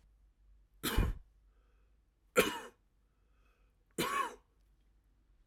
three_cough_length: 5.5 s
three_cough_amplitude: 6163
three_cough_signal_mean_std_ratio: 0.31
survey_phase: alpha (2021-03-01 to 2021-08-12)
age: 45-64
gender: Male
wearing_mask: 'No'
symptom_none: true
smoker_status: Never smoked
respiratory_condition_asthma: false
respiratory_condition_other: false
recruitment_source: REACT
submission_delay: 1 day
covid_test_result: Negative
covid_test_method: RT-qPCR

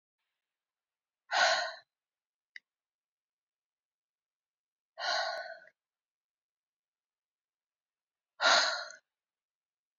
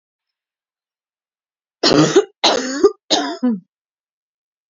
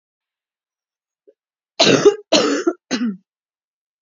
exhalation_length: 10.0 s
exhalation_amplitude: 8094
exhalation_signal_mean_std_ratio: 0.26
three_cough_length: 4.7 s
three_cough_amplitude: 32300
three_cough_signal_mean_std_ratio: 0.38
cough_length: 4.0 s
cough_amplitude: 30450
cough_signal_mean_std_ratio: 0.36
survey_phase: alpha (2021-03-01 to 2021-08-12)
age: 18-44
gender: Female
wearing_mask: 'No'
symptom_cough_any: true
symptom_shortness_of_breath: true
symptom_diarrhoea: true
symptom_fatigue: true
symptom_headache: true
symptom_change_to_sense_of_smell_or_taste: true
symptom_onset: 3 days
smoker_status: Current smoker (1 to 10 cigarettes per day)
respiratory_condition_asthma: true
respiratory_condition_other: false
recruitment_source: Test and Trace
submission_delay: 2 days
covid_test_result: Positive
covid_test_method: RT-qPCR
covid_ct_value: 18.3
covid_ct_gene: ORF1ab gene
covid_ct_mean: 18.6
covid_viral_load: 790000 copies/ml
covid_viral_load_category: Low viral load (10K-1M copies/ml)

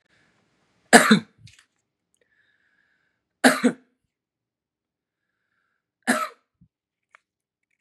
three_cough_length: 7.8 s
three_cough_amplitude: 32768
three_cough_signal_mean_std_ratio: 0.2
survey_phase: beta (2021-08-13 to 2022-03-07)
age: 45-64
gender: Male
wearing_mask: 'No'
symptom_none: true
smoker_status: Never smoked
respiratory_condition_asthma: false
respiratory_condition_other: false
recruitment_source: REACT
submission_delay: 4 days
covid_test_result: Negative
covid_test_method: RT-qPCR
influenza_a_test_result: Negative
influenza_b_test_result: Negative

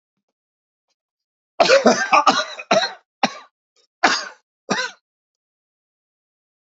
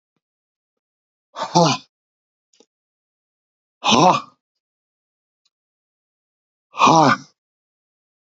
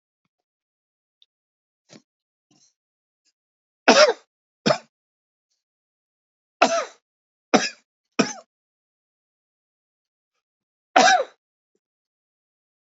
cough_length: 6.7 s
cough_amplitude: 28216
cough_signal_mean_std_ratio: 0.34
exhalation_length: 8.3 s
exhalation_amplitude: 28753
exhalation_signal_mean_std_ratio: 0.27
three_cough_length: 12.9 s
three_cough_amplitude: 30178
three_cough_signal_mean_std_ratio: 0.21
survey_phase: beta (2021-08-13 to 2022-03-07)
age: 65+
gender: Male
wearing_mask: 'No'
symptom_cough_any: true
symptom_runny_or_blocked_nose: true
symptom_fatigue: true
smoker_status: Never smoked
respiratory_condition_asthma: false
respiratory_condition_other: false
recruitment_source: Test and Trace
submission_delay: 1 day
covid_test_result: Positive
covid_test_method: RT-qPCR
covid_ct_value: 19.7
covid_ct_gene: ORF1ab gene
covid_ct_mean: 20.0
covid_viral_load: 270000 copies/ml
covid_viral_load_category: Low viral load (10K-1M copies/ml)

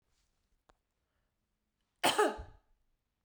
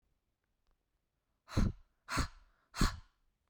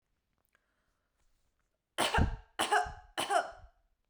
cough_length: 3.2 s
cough_amplitude: 6229
cough_signal_mean_std_ratio: 0.24
exhalation_length: 3.5 s
exhalation_amplitude: 4895
exhalation_signal_mean_std_ratio: 0.3
three_cough_length: 4.1 s
three_cough_amplitude: 6022
three_cough_signal_mean_std_ratio: 0.38
survey_phase: beta (2021-08-13 to 2022-03-07)
age: 18-44
gender: Female
wearing_mask: 'No'
symptom_cough_any: true
symptom_runny_or_blocked_nose: true
symptom_onset: 7 days
smoker_status: Never smoked
respiratory_condition_asthma: false
respiratory_condition_other: false
recruitment_source: REACT
submission_delay: 2 days
covid_test_result: Negative
covid_test_method: RT-qPCR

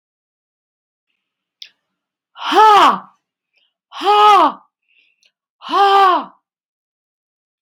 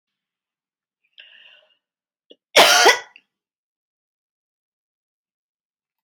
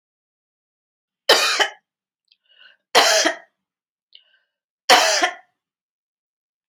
exhalation_length: 7.6 s
exhalation_amplitude: 30631
exhalation_signal_mean_std_ratio: 0.39
cough_length: 6.0 s
cough_amplitude: 30921
cough_signal_mean_std_ratio: 0.21
three_cough_length: 6.7 s
three_cough_amplitude: 32767
three_cough_signal_mean_std_ratio: 0.32
survey_phase: beta (2021-08-13 to 2022-03-07)
age: 65+
gender: Female
wearing_mask: 'No'
symptom_none: true
smoker_status: Never smoked
respiratory_condition_asthma: false
respiratory_condition_other: false
recruitment_source: REACT
submission_delay: 1 day
covid_test_result: Negative
covid_test_method: RT-qPCR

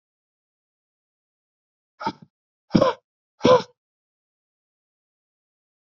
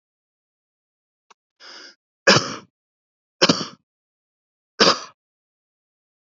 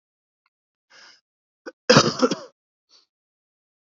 exhalation_length: 6.0 s
exhalation_amplitude: 27036
exhalation_signal_mean_std_ratio: 0.2
three_cough_length: 6.2 s
three_cough_amplitude: 29615
three_cough_signal_mean_std_ratio: 0.22
cough_length: 3.8 s
cough_amplitude: 32209
cough_signal_mean_std_ratio: 0.23
survey_phase: beta (2021-08-13 to 2022-03-07)
age: 18-44
gender: Male
wearing_mask: 'No'
symptom_cough_any: true
symptom_runny_or_blocked_nose: true
symptom_fever_high_temperature: true
symptom_headache: true
symptom_other: true
symptom_onset: 3 days
smoker_status: Never smoked
respiratory_condition_asthma: false
respiratory_condition_other: false
recruitment_source: Test and Trace
submission_delay: 1 day
covid_test_result: Positive
covid_test_method: RT-qPCR
covid_ct_value: 19.1
covid_ct_gene: ORF1ab gene
covid_ct_mean: 19.5
covid_viral_load: 400000 copies/ml
covid_viral_load_category: Low viral load (10K-1M copies/ml)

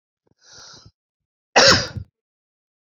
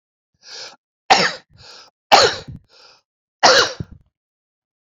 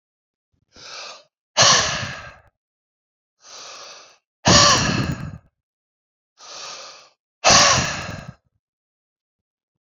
cough_length: 2.9 s
cough_amplitude: 30352
cough_signal_mean_std_ratio: 0.26
three_cough_length: 4.9 s
three_cough_amplitude: 32768
three_cough_signal_mean_std_ratio: 0.31
exhalation_length: 10.0 s
exhalation_amplitude: 31932
exhalation_signal_mean_std_ratio: 0.35
survey_phase: beta (2021-08-13 to 2022-03-07)
age: 45-64
gender: Male
wearing_mask: 'No'
symptom_runny_or_blocked_nose: true
symptom_abdominal_pain: true
symptom_diarrhoea: true
symptom_fatigue: true
symptom_headache: true
symptom_change_to_sense_of_smell_or_taste: true
symptom_loss_of_taste: true
symptom_other: true
symptom_onset: 3 days
smoker_status: Ex-smoker
respiratory_condition_asthma: false
respiratory_condition_other: false
recruitment_source: Test and Trace
submission_delay: 2 days
covid_test_result: Positive
covid_test_method: ePCR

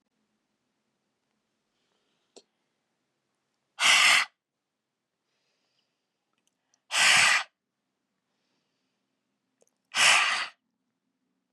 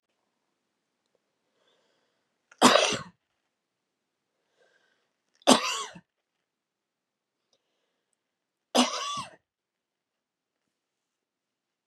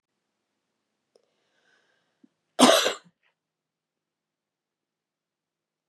exhalation_length: 11.5 s
exhalation_amplitude: 13252
exhalation_signal_mean_std_ratio: 0.28
three_cough_length: 11.9 s
three_cough_amplitude: 24848
three_cough_signal_mean_std_ratio: 0.2
cough_length: 5.9 s
cough_amplitude: 25464
cough_signal_mean_std_ratio: 0.17
survey_phase: beta (2021-08-13 to 2022-03-07)
age: 45-64
gender: Female
wearing_mask: 'No'
symptom_sore_throat: true
symptom_change_to_sense_of_smell_or_taste: true
symptom_loss_of_taste: true
smoker_status: Never smoked
respiratory_condition_asthma: false
respiratory_condition_other: false
recruitment_source: Test and Trace
submission_delay: 2 days
covid_test_result: Positive
covid_test_method: RT-qPCR
covid_ct_value: 24.0
covid_ct_gene: ORF1ab gene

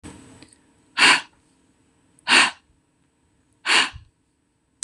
exhalation_length: 4.8 s
exhalation_amplitude: 25762
exhalation_signal_mean_std_ratio: 0.3
survey_phase: beta (2021-08-13 to 2022-03-07)
age: 18-44
gender: Female
wearing_mask: 'No'
symptom_cough_any: true
symptom_new_continuous_cough: true
smoker_status: Never smoked
respiratory_condition_asthma: false
respiratory_condition_other: false
recruitment_source: REACT
submission_delay: 3 days
covid_test_result: Negative
covid_test_method: RT-qPCR
influenza_a_test_result: Negative
influenza_b_test_result: Negative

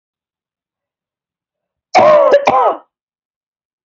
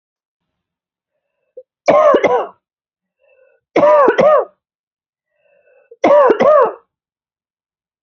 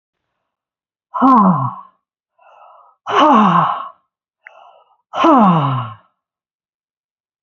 cough_length: 3.8 s
cough_amplitude: 30558
cough_signal_mean_std_ratio: 0.38
three_cough_length: 8.0 s
three_cough_amplitude: 31018
three_cough_signal_mean_std_ratio: 0.41
exhalation_length: 7.4 s
exhalation_amplitude: 32283
exhalation_signal_mean_std_ratio: 0.44
survey_phase: beta (2021-08-13 to 2022-03-07)
age: 45-64
gender: Female
wearing_mask: 'No'
symptom_none: true
smoker_status: Never smoked
respiratory_condition_asthma: false
respiratory_condition_other: false
recruitment_source: REACT
submission_delay: 1 day
covid_test_result: Negative
covid_test_method: RT-qPCR
influenza_a_test_result: Negative
influenza_b_test_result: Negative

